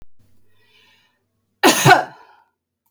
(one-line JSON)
{"cough_length": "2.9 s", "cough_amplitude": 31979, "cough_signal_mean_std_ratio": 0.29, "survey_phase": "beta (2021-08-13 to 2022-03-07)", "age": "45-64", "gender": "Female", "wearing_mask": "No", "symptom_none": true, "smoker_status": "Never smoked", "respiratory_condition_asthma": false, "respiratory_condition_other": false, "recruitment_source": "REACT", "submission_delay": "1 day", "covid_test_result": "Negative", "covid_test_method": "RT-qPCR"}